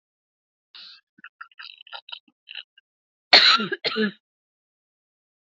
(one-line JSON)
{"cough_length": "5.5 s", "cough_amplitude": 30341, "cough_signal_mean_std_ratio": 0.25, "survey_phase": "beta (2021-08-13 to 2022-03-07)", "age": "45-64", "gender": "Female", "wearing_mask": "No", "symptom_none": true, "smoker_status": "Never smoked", "respiratory_condition_asthma": false, "respiratory_condition_other": false, "recruitment_source": "REACT", "submission_delay": "1 day", "covid_test_result": "Negative", "covid_test_method": "RT-qPCR", "influenza_a_test_result": "Negative", "influenza_b_test_result": "Negative"}